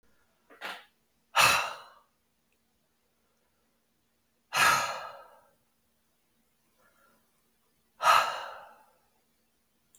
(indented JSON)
{
  "exhalation_length": "10.0 s",
  "exhalation_amplitude": 12545,
  "exhalation_signal_mean_std_ratio": 0.28,
  "survey_phase": "beta (2021-08-13 to 2022-03-07)",
  "age": "45-64",
  "gender": "Male",
  "wearing_mask": "No",
  "symptom_change_to_sense_of_smell_or_taste": true,
  "symptom_onset": "3 days",
  "smoker_status": "Ex-smoker",
  "respiratory_condition_asthma": false,
  "respiratory_condition_other": false,
  "recruitment_source": "Test and Trace",
  "submission_delay": "2 days",
  "covid_test_result": "Positive",
  "covid_test_method": "RT-qPCR"
}